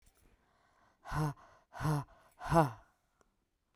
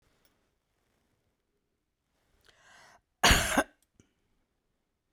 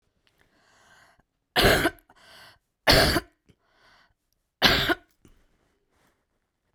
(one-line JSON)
{"exhalation_length": "3.8 s", "exhalation_amplitude": 6524, "exhalation_signal_mean_std_ratio": 0.34, "cough_length": "5.1 s", "cough_amplitude": 11602, "cough_signal_mean_std_ratio": 0.21, "three_cough_length": "6.7 s", "three_cough_amplitude": 28021, "three_cough_signal_mean_std_ratio": 0.31, "survey_phase": "beta (2021-08-13 to 2022-03-07)", "age": "45-64", "gender": "Female", "wearing_mask": "No", "symptom_sore_throat": true, "symptom_headache": true, "symptom_onset": "10 days", "smoker_status": "Never smoked", "respiratory_condition_asthma": false, "respiratory_condition_other": false, "recruitment_source": "Test and Trace", "submission_delay": "2 days", "covid_test_result": "Positive", "covid_test_method": "ePCR"}